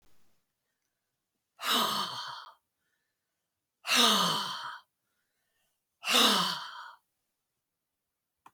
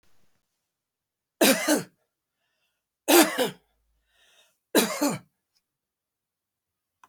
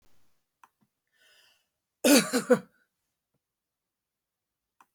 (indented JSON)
{
  "exhalation_length": "8.5 s",
  "exhalation_amplitude": 10736,
  "exhalation_signal_mean_std_ratio": 0.38,
  "three_cough_length": "7.1 s",
  "three_cough_amplitude": 25339,
  "three_cough_signal_mean_std_ratio": 0.29,
  "cough_length": "4.9 s",
  "cough_amplitude": 15905,
  "cough_signal_mean_std_ratio": 0.22,
  "survey_phase": "beta (2021-08-13 to 2022-03-07)",
  "age": "65+",
  "gender": "Female",
  "wearing_mask": "No",
  "symptom_none": true,
  "smoker_status": "Never smoked",
  "respiratory_condition_asthma": false,
  "respiratory_condition_other": false,
  "recruitment_source": "REACT",
  "submission_delay": "1 day",
  "covid_test_result": "Negative",
  "covid_test_method": "RT-qPCR"
}